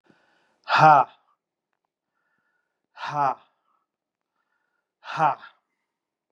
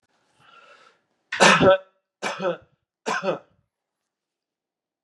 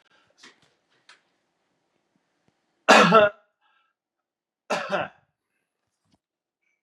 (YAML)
exhalation_length: 6.3 s
exhalation_amplitude: 26788
exhalation_signal_mean_std_ratio: 0.26
three_cough_length: 5.0 s
three_cough_amplitude: 30174
three_cough_signal_mean_std_ratio: 0.31
cough_length: 6.8 s
cough_amplitude: 26497
cough_signal_mean_std_ratio: 0.23
survey_phase: beta (2021-08-13 to 2022-03-07)
age: 65+
gender: Male
wearing_mask: 'No'
symptom_cough_any: true
symptom_runny_or_blocked_nose: true
symptom_sore_throat: true
symptom_change_to_sense_of_smell_or_taste: true
symptom_onset: 2 days
smoker_status: Ex-smoker
respiratory_condition_asthma: false
respiratory_condition_other: false
recruitment_source: Test and Trace
submission_delay: 2 days
covid_test_result: Positive
covid_test_method: RT-qPCR
covid_ct_value: 16.4
covid_ct_gene: ORF1ab gene
covid_ct_mean: 16.9
covid_viral_load: 3000000 copies/ml
covid_viral_load_category: High viral load (>1M copies/ml)